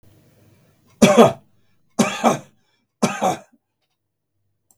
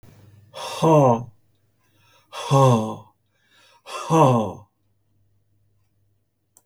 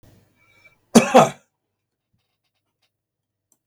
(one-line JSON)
{"three_cough_length": "4.8 s", "three_cough_amplitude": 32768, "three_cough_signal_mean_std_ratio": 0.31, "exhalation_length": "6.7 s", "exhalation_amplitude": 22803, "exhalation_signal_mean_std_ratio": 0.39, "cough_length": "3.7 s", "cough_amplitude": 32768, "cough_signal_mean_std_ratio": 0.2, "survey_phase": "beta (2021-08-13 to 2022-03-07)", "age": "65+", "gender": "Male", "wearing_mask": "No", "symptom_none": true, "smoker_status": "Ex-smoker", "respiratory_condition_asthma": false, "respiratory_condition_other": false, "recruitment_source": "REACT", "submission_delay": "1 day", "covid_test_result": "Negative", "covid_test_method": "RT-qPCR", "influenza_a_test_result": "Unknown/Void", "influenza_b_test_result": "Unknown/Void"}